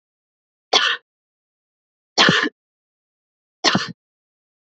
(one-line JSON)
{"three_cough_length": "4.7 s", "three_cough_amplitude": 30481, "three_cough_signal_mean_std_ratio": 0.3, "survey_phase": "beta (2021-08-13 to 2022-03-07)", "age": "18-44", "gender": "Female", "wearing_mask": "No", "symptom_runny_or_blocked_nose": true, "symptom_sore_throat": true, "symptom_diarrhoea": true, "symptom_fatigue": true, "symptom_onset": "4 days", "smoker_status": "Never smoked", "respiratory_condition_asthma": false, "respiratory_condition_other": false, "recruitment_source": "Test and Trace", "submission_delay": "1 day", "covid_test_result": "Positive", "covid_test_method": "RT-qPCR", "covid_ct_value": 18.9, "covid_ct_gene": "ORF1ab gene", "covid_ct_mean": 19.5, "covid_viral_load": "410000 copies/ml", "covid_viral_load_category": "Low viral load (10K-1M copies/ml)"}